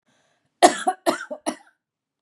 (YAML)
cough_length: 2.2 s
cough_amplitude: 32767
cough_signal_mean_std_ratio: 0.28
survey_phase: beta (2021-08-13 to 2022-03-07)
age: 45-64
gender: Female
wearing_mask: 'No'
symptom_fatigue: true
smoker_status: Ex-smoker
respiratory_condition_asthma: true
respiratory_condition_other: false
recruitment_source: REACT
submission_delay: 1 day
covid_test_result: Negative
covid_test_method: RT-qPCR
influenza_a_test_result: Unknown/Void
influenza_b_test_result: Unknown/Void